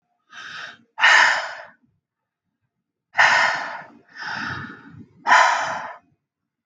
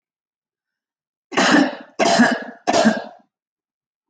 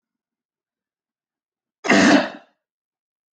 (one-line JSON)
{"exhalation_length": "6.7 s", "exhalation_amplitude": 30597, "exhalation_signal_mean_std_ratio": 0.42, "three_cough_length": "4.1 s", "three_cough_amplitude": 24949, "three_cough_signal_mean_std_ratio": 0.44, "cough_length": "3.3 s", "cough_amplitude": 26623, "cough_signal_mean_std_ratio": 0.28, "survey_phase": "beta (2021-08-13 to 2022-03-07)", "age": "18-44", "gender": "Female", "wearing_mask": "No", "symptom_none": true, "smoker_status": "Never smoked", "respiratory_condition_asthma": false, "respiratory_condition_other": false, "recruitment_source": "REACT", "submission_delay": "1 day", "covid_test_result": "Negative", "covid_test_method": "RT-qPCR", "influenza_a_test_result": "Negative", "influenza_b_test_result": "Negative"}